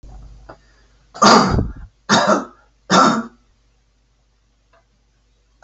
{"three_cough_length": "5.6 s", "three_cough_amplitude": 32768, "three_cough_signal_mean_std_ratio": 0.37, "survey_phase": "alpha (2021-03-01 to 2021-08-12)", "age": "65+", "gender": "Male", "wearing_mask": "No", "symptom_none": true, "smoker_status": "Never smoked", "respiratory_condition_asthma": false, "respiratory_condition_other": false, "recruitment_source": "REACT", "submission_delay": "1 day", "covid_test_result": "Negative", "covid_test_method": "RT-qPCR"}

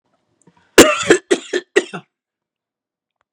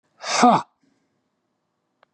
{"cough_length": "3.3 s", "cough_amplitude": 32768, "cough_signal_mean_std_ratio": 0.29, "exhalation_length": "2.1 s", "exhalation_amplitude": 28102, "exhalation_signal_mean_std_ratio": 0.29, "survey_phase": "beta (2021-08-13 to 2022-03-07)", "age": "45-64", "gender": "Male", "wearing_mask": "No", "symptom_runny_or_blocked_nose": true, "symptom_fatigue": true, "smoker_status": "Never smoked", "respiratory_condition_asthma": false, "respiratory_condition_other": false, "recruitment_source": "REACT", "submission_delay": "5 days", "covid_test_result": "Negative", "covid_test_method": "RT-qPCR"}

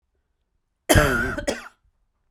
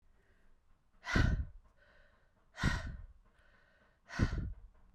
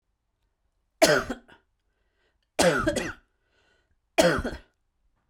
{"cough_length": "2.3 s", "cough_amplitude": 32767, "cough_signal_mean_std_ratio": 0.37, "exhalation_length": "4.9 s", "exhalation_amplitude": 4719, "exhalation_signal_mean_std_ratio": 0.39, "three_cough_length": "5.3 s", "three_cough_amplitude": 23310, "three_cough_signal_mean_std_ratio": 0.34, "survey_phase": "beta (2021-08-13 to 2022-03-07)", "age": "45-64", "gender": "Female", "wearing_mask": "No", "symptom_runny_or_blocked_nose": true, "symptom_sore_throat": true, "symptom_fever_high_temperature": true, "symptom_onset": "6 days", "smoker_status": "Ex-smoker", "respiratory_condition_asthma": false, "respiratory_condition_other": false, "recruitment_source": "Test and Trace", "submission_delay": "2 days", "covid_test_result": "Positive", "covid_test_method": "RT-qPCR", "covid_ct_value": 15.2, "covid_ct_gene": "ORF1ab gene", "covid_ct_mean": 15.5, "covid_viral_load": "8100000 copies/ml", "covid_viral_load_category": "High viral load (>1M copies/ml)"}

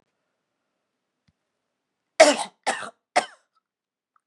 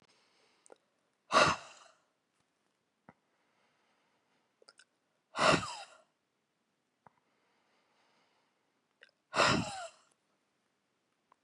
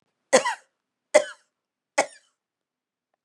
{"cough_length": "4.3 s", "cough_amplitude": 32767, "cough_signal_mean_std_ratio": 0.2, "exhalation_length": "11.4 s", "exhalation_amplitude": 8977, "exhalation_signal_mean_std_ratio": 0.23, "three_cough_length": "3.2 s", "three_cough_amplitude": 24726, "three_cough_signal_mean_std_ratio": 0.23, "survey_phase": "beta (2021-08-13 to 2022-03-07)", "age": "45-64", "gender": "Female", "wearing_mask": "No", "symptom_cough_any": true, "symptom_runny_or_blocked_nose": true, "symptom_shortness_of_breath": true, "symptom_sore_throat": true, "symptom_diarrhoea": true, "symptom_fatigue": true, "symptom_headache": true, "symptom_change_to_sense_of_smell_or_taste": true, "symptom_onset": "6 days", "smoker_status": "Ex-smoker", "respiratory_condition_asthma": false, "respiratory_condition_other": false, "recruitment_source": "Test and Trace", "submission_delay": "1 day", "covid_test_result": "Positive", "covid_test_method": "RT-qPCR", "covid_ct_value": 31.9, "covid_ct_gene": "N gene"}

